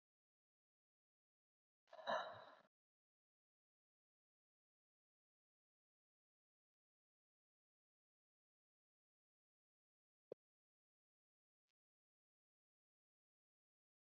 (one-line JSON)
{"exhalation_length": "14.1 s", "exhalation_amplitude": 820, "exhalation_signal_mean_std_ratio": 0.12, "survey_phase": "beta (2021-08-13 to 2022-03-07)", "age": "18-44", "gender": "Female", "wearing_mask": "No", "symptom_cough_any": true, "symptom_new_continuous_cough": true, "symptom_runny_or_blocked_nose": true, "symptom_sore_throat": true, "symptom_fatigue": true, "symptom_other": true, "symptom_onset": "6 days", "smoker_status": "Never smoked", "respiratory_condition_asthma": false, "respiratory_condition_other": false, "recruitment_source": "Test and Trace", "submission_delay": "1 day", "covid_test_result": "Positive", "covid_test_method": "RT-qPCR", "covid_ct_value": 20.6, "covid_ct_gene": "N gene", "covid_ct_mean": 21.2, "covid_viral_load": "110000 copies/ml", "covid_viral_load_category": "Low viral load (10K-1M copies/ml)"}